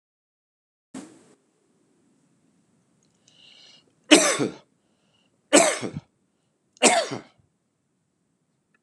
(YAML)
three_cough_length: 8.8 s
three_cough_amplitude: 32573
three_cough_signal_mean_std_ratio: 0.24
survey_phase: beta (2021-08-13 to 2022-03-07)
age: 65+
gender: Male
wearing_mask: 'No'
symptom_cough_any: true
symptom_runny_or_blocked_nose: true
smoker_status: Never smoked
respiratory_condition_asthma: false
respiratory_condition_other: false
recruitment_source: Test and Trace
submission_delay: 2 days
covid_test_result: Positive
covid_test_method: LFT